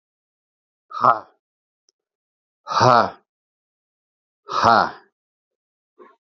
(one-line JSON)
{"exhalation_length": "6.2 s", "exhalation_amplitude": 28093, "exhalation_signal_mean_std_ratio": 0.28, "survey_phase": "alpha (2021-03-01 to 2021-08-12)", "age": "45-64", "gender": "Male", "wearing_mask": "No", "symptom_fatigue": true, "symptom_onset": "4 days", "smoker_status": "Ex-smoker", "respiratory_condition_asthma": false, "respiratory_condition_other": false, "recruitment_source": "Test and Trace", "submission_delay": "2 days", "covid_test_result": "Positive", "covid_test_method": "RT-qPCR"}